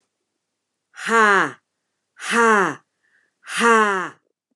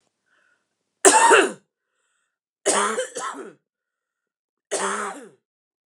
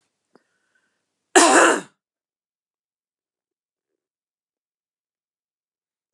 {"exhalation_length": "4.6 s", "exhalation_amplitude": 26469, "exhalation_signal_mean_std_ratio": 0.43, "three_cough_length": "5.9 s", "three_cough_amplitude": 32494, "three_cough_signal_mean_std_ratio": 0.34, "cough_length": "6.1 s", "cough_amplitude": 31759, "cough_signal_mean_std_ratio": 0.21, "survey_phase": "beta (2021-08-13 to 2022-03-07)", "age": "45-64", "gender": "Female", "wearing_mask": "No", "symptom_none": true, "smoker_status": "Never smoked", "respiratory_condition_asthma": false, "respiratory_condition_other": false, "recruitment_source": "REACT", "submission_delay": "1 day", "covid_test_result": "Negative", "covid_test_method": "RT-qPCR"}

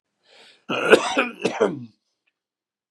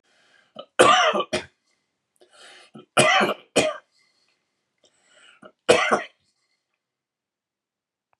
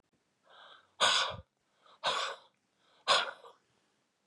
{"cough_length": "2.9 s", "cough_amplitude": 32482, "cough_signal_mean_std_ratio": 0.37, "three_cough_length": "8.2 s", "three_cough_amplitude": 32767, "three_cough_signal_mean_std_ratio": 0.32, "exhalation_length": "4.3 s", "exhalation_amplitude": 8732, "exhalation_signal_mean_std_ratio": 0.36, "survey_phase": "beta (2021-08-13 to 2022-03-07)", "age": "45-64", "gender": "Male", "wearing_mask": "No", "symptom_diarrhoea": true, "symptom_onset": "2 days", "smoker_status": "Ex-smoker", "respiratory_condition_asthma": false, "respiratory_condition_other": false, "recruitment_source": "Test and Trace", "submission_delay": "1 day", "covid_test_result": "Positive", "covid_test_method": "RT-qPCR", "covid_ct_value": 25.9, "covid_ct_gene": "ORF1ab gene"}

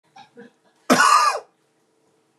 {"cough_length": "2.4 s", "cough_amplitude": 25730, "cough_signal_mean_std_ratio": 0.38, "survey_phase": "beta (2021-08-13 to 2022-03-07)", "age": "45-64", "gender": "Male", "wearing_mask": "No", "symptom_none": true, "smoker_status": "Ex-smoker", "respiratory_condition_asthma": false, "respiratory_condition_other": false, "recruitment_source": "REACT", "submission_delay": "1 day", "covid_test_result": "Negative", "covid_test_method": "RT-qPCR", "influenza_a_test_result": "Negative", "influenza_b_test_result": "Negative"}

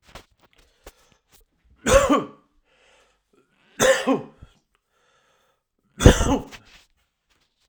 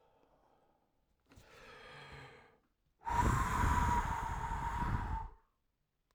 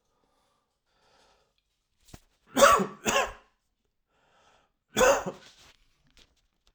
{"three_cough_length": "7.7 s", "three_cough_amplitude": 32768, "three_cough_signal_mean_std_ratio": 0.28, "exhalation_length": "6.1 s", "exhalation_amplitude": 3672, "exhalation_signal_mean_std_ratio": 0.53, "cough_length": "6.7 s", "cough_amplitude": 19156, "cough_signal_mean_std_ratio": 0.27, "survey_phase": "alpha (2021-03-01 to 2021-08-12)", "age": "18-44", "gender": "Male", "wearing_mask": "No", "symptom_diarrhoea": true, "symptom_headache": true, "smoker_status": "Current smoker (e-cigarettes or vapes only)", "respiratory_condition_asthma": false, "respiratory_condition_other": false, "recruitment_source": "Test and Trace", "submission_delay": "3 days", "covid_test_result": "Positive", "covid_test_method": "RT-qPCR", "covid_ct_value": 23.1, "covid_ct_gene": "ORF1ab gene"}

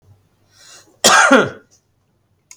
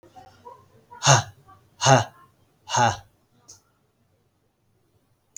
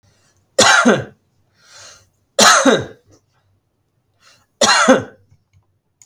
{"cough_length": "2.6 s", "cough_amplitude": 32768, "cough_signal_mean_std_ratio": 0.35, "exhalation_length": "5.4 s", "exhalation_amplitude": 29685, "exhalation_signal_mean_std_ratio": 0.28, "three_cough_length": "6.1 s", "three_cough_amplitude": 32768, "three_cough_signal_mean_std_ratio": 0.38, "survey_phase": "beta (2021-08-13 to 2022-03-07)", "age": "45-64", "gender": "Male", "wearing_mask": "No", "symptom_none": true, "smoker_status": "Never smoked", "respiratory_condition_asthma": true, "respiratory_condition_other": false, "recruitment_source": "REACT", "submission_delay": "12 days", "covid_test_result": "Negative", "covid_test_method": "RT-qPCR", "influenza_a_test_result": "Negative", "influenza_b_test_result": "Negative"}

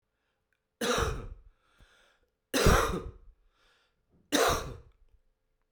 {"three_cough_length": "5.7 s", "three_cough_amplitude": 11664, "three_cough_signal_mean_std_ratio": 0.37, "survey_phase": "alpha (2021-03-01 to 2021-08-12)", "age": "45-64", "gender": "Male", "wearing_mask": "No", "symptom_cough_any": true, "symptom_fatigue": true, "symptom_fever_high_temperature": true, "symptom_headache": true, "symptom_change_to_sense_of_smell_or_taste": true, "symptom_loss_of_taste": true, "smoker_status": "Never smoked", "respiratory_condition_asthma": false, "respiratory_condition_other": false, "recruitment_source": "Test and Trace", "submission_delay": "1 day", "covid_test_result": "Positive", "covid_test_method": "RT-qPCR"}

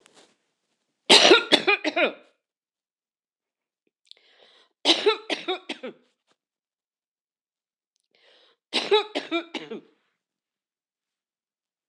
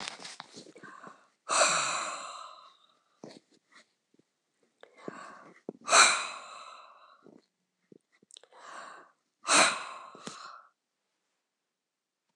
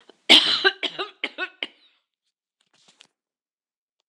{"three_cough_length": "11.9 s", "three_cough_amplitude": 26027, "three_cough_signal_mean_std_ratio": 0.27, "exhalation_length": "12.4 s", "exhalation_amplitude": 15685, "exhalation_signal_mean_std_ratio": 0.3, "cough_length": "4.1 s", "cough_amplitude": 26028, "cough_signal_mean_std_ratio": 0.26, "survey_phase": "beta (2021-08-13 to 2022-03-07)", "age": "65+", "gender": "Female", "wearing_mask": "No", "symptom_none": true, "smoker_status": "Never smoked", "respiratory_condition_asthma": true, "respiratory_condition_other": false, "recruitment_source": "REACT", "submission_delay": "0 days", "covid_test_result": "Negative", "covid_test_method": "RT-qPCR"}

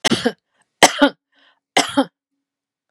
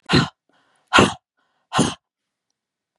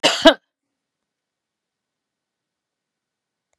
{"three_cough_length": "2.9 s", "three_cough_amplitude": 32768, "three_cough_signal_mean_std_ratio": 0.32, "exhalation_length": "3.0 s", "exhalation_amplitude": 31663, "exhalation_signal_mean_std_ratio": 0.32, "cough_length": "3.6 s", "cough_amplitude": 32767, "cough_signal_mean_std_ratio": 0.18, "survey_phase": "beta (2021-08-13 to 2022-03-07)", "age": "65+", "gender": "Female", "wearing_mask": "No", "symptom_none": true, "smoker_status": "Ex-smoker", "respiratory_condition_asthma": false, "respiratory_condition_other": false, "recruitment_source": "REACT", "submission_delay": "1 day", "covid_test_result": "Negative", "covid_test_method": "RT-qPCR", "influenza_a_test_result": "Negative", "influenza_b_test_result": "Negative"}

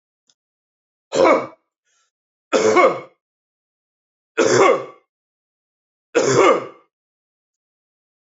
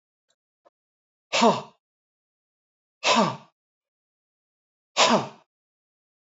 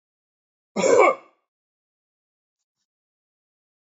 {"three_cough_length": "8.4 s", "three_cough_amplitude": 26825, "three_cough_signal_mean_std_ratio": 0.36, "exhalation_length": "6.2 s", "exhalation_amplitude": 18237, "exhalation_signal_mean_std_ratio": 0.28, "cough_length": "3.9 s", "cough_amplitude": 23717, "cough_signal_mean_std_ratio": 0.24, "survey_phase": "beta (2021-08-13 to 2022-03-07)", "age": "45-64", "gender": "Male", "wearing_mask": "No", "symptom_cough_any": true, "symptom_onset": "2 days", "smoker_status": "Never smoked", "respiratory_condition_asthma": false, "respiratory_condition_other": false, "recruitment_source": "Test and Trace", "submission_delay": "1 day", "covid_test_result": "Positive", "covid_test_method": "RT-qPCR"}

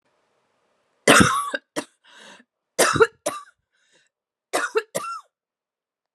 {"three_cough_length": "6.1 s", "three_cough_amplitude": 32474, "three_cough_signal_mean_std_ratio": 0.31, "survey_phase": "beta (2021-08-13 to 2022-03-07)", "age": "45-64", "gender": "Female", "wearing_mask": "No", "symptom_new_continuous_cough": true, "symptom_runny_or_blocked_nose": true, "symptom_shortness_of_breath": true, "symptom_fatigue": true, "symptom_headache": true, "symptom_change_to_sense_of_smell_or_taste": true, "symptom_onset": "3 days", "smoker_status": "Never smoked", "respiratory_condition_asthma": false, "respiratory_condition_other": false, "recruitment_source": "Test and Trace", "submission_delay": "1 day", "covid_test_result": "Positive", "covid_test_method": "RT-qPCR", "covid_ct_value": 21.1, "covid_ct_gene": "ORF1ab gene", "covid_ct_mean": 22.0, "covid_viral_load": "63000 copies/ml", "covid_viral_load_category": "Low viral load (10K-1M copies/ml)"}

